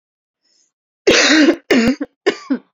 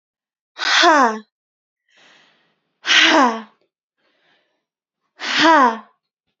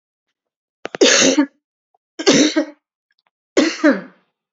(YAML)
cough_length: 2.7 s
cough_amplitude: 32052
cough_signal_mean_std_ratio: 0.51
exhalation_length: 6.4 s
exhalation_amplitude: 30144
exhalation_signal_mean_std_ratio: 0.4
three_cough_length: 4.5 s
three_cough_amplitude: 32768
three_cough_signal_mean_std_ratio: 0.41
survey_phase: beta (2021-08-13 to 2022-03-07)
age: 18-44
gender: Female
wearing_mask: 'No'
symptom_cough_any: true
symptom_sore_throat: true
smoker_status: Never smoked
respiratory_condition_asthma: true
respiratory_condition_other: false
recruitment_source: REACT
submission_delay: 1 day
covid_test_result: Negative
covid_test_method: RT-qPCR
influenza_a_test_result: Negative
influenza_b_test_result: Negative